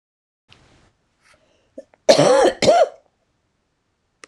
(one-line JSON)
{"cough_length": "4.3 s", "cough_amplitude": 26028, "cough_signal_mean_std_ratio": 0.34, "survey_phase": "beta (2021-08-13 to 2022-03-07)", "age": "65+", "gender": "Female", "wearing_mask": "No", "symptom_runny_or_blocked_nose": true, "symptom_change_to_sense_of_smell_or_taste": true, "symptom_onset": "12 days", "smoker_status": "Ex-smoker", "respiratory_condition_asthma": false, "respiratory_condition_other": false, "recruitment_source": "REACT", "submission_delay": "2 days", "covid_test_result": "Negative", "covid_test_method": "RT-qPCR"}